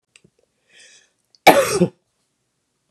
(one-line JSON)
{"cough_length": "2.9 s", "cough_amplitude": 32768, "cough_signal_mean_std_ratio": 0.26, "survey_phase": "beta (2021-08-13 to 2022-03-07)", "age": "45-64", "gender": "Female", "wearing_mask": "No", "symptom_cough_any": true, "symptom_runny_or_blocked_nose": true, "symptom_sore_throat": true, "symptom_onset": "9 days", "smoker_status": "Ex-smoker", "respiratory_condition_asthma": false, "respiratory_condition_other": false, "recruitment_source": "REACT", "submission_delay": "0 days", "covid_test_result": "Positive", "covid_test_method": "RT-qPCR", "covid_ct_value": 25.0, "covid_ct_gene": "E gene", "influenza_a_test_result": "Negative", "influenza_b_test_result": "Negative"}